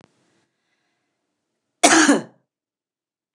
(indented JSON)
{
  "three_cough_length": "3.3 s",
  "three_cough_amplitude": 29204,
  "three_cough_signal_mean_std_ratio": 0.26,
  "survey_phase": "alpha (2021-03-01 to 2021-08-12)",
  "age": "65+",
  "gender": "Female",
  "wearing_mask": "No",
  "symptom_none": true,
  "smoker_status": "Ex-smoker",
  "respiratory_condition_asthma": false,
  "respiratory_condition_other": false,
  "recruitment_source": "REACT",
  "submission_delay": "6 days",
  "covid_test_result": "Negative",
  "covid_test_method": "RT-qPCR"
}